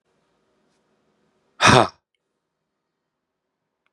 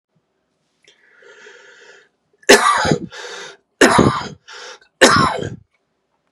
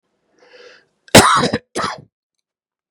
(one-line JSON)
{"exhalation_length": "3.9 s", "exhalation_amplitude": 32767, "exhalation_signal_mean_std_ratio": 0.19, "three_cough_length": "6.3 s", "three_cough_amplitude": 32768, "three_cough_signal_mean_std_ratio": 0.37, "cough_length": "2.9 s", "cough_amplitude": 32768, "cough_signal_mean_std_ratio": 0.31, "survey_phase": "beta (2021-08-13 to 2022-03-07)", "age": "45-64", "gender": "Male", "wearing_mask": "No", "symptom_sore_throat": true, "symptom_headache": true, "smoker_status": "Never smoked", "respiratory_condition_asthma": false, "respiratory_condition_other": false, "recruitment_source": "Test and Trace", "submission_delay": "1 day", "covid_test_result": "Positive", "covid_test_method": "RT-qPCR", "covid_ct_value": 22.4, "covid_ct_gene": "ORF1ab gene"}